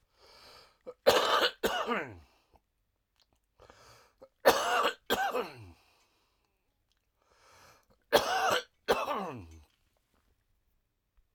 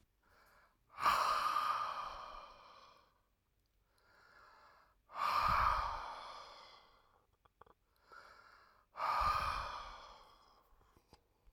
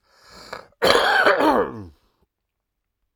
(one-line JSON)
{"three_cough_length": "11.3 s", "three_cough_amplitude": 14883, "three_cough_signal_mean_std_ratio": 0.37, "exhalation_length": "11.5 s", "exhalation_amplitude": 2914, "exhalation_signal_mean_std_ratio": 0.46, "cough_length": "3.2 s", "cough_amplitude": 32768, "cough_signal_mean_std_ratio": 0.46, "survey_phase": "alpha (2021-03-01 to 2021-08-12)", "age": "65+", "gender": "Male", "wearing_mask": "No", "symptom_none": true, "smoker_status": "Ex-smoker", "respiratory_condition_asthma": false, "respiratory_condition_other": false, "recruitment_source": "REACT", "submission_delay": "3 days", "covid_test_result": "Negative", "covid_test_method": "RT-qPCR"}